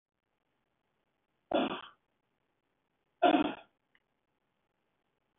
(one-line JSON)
{"three_cough_length": "5.4 s", "three_cough_amplitude": 6991, "three_cough_signal_mean_std_ratio": 0.23, "survey_phase": "beta (2021-08-13 to 2022-03-07)", "age": "45-64", "gender": "Male", "wearing_mask": "No", "symptom_none": true, "smoker_status": "Ex-smoker", "respiratory_condition_asthma": false, "respiratory_condition_other": false, "recruitment_source": "REACT", "submission_delay": "2 days", "covid_test_result": "Negative", "covid_test_method": "RT-qPCR", "influenza_a_test_result": "Unknown/Void", "influenza_b_test_result": "Unknown/Void"}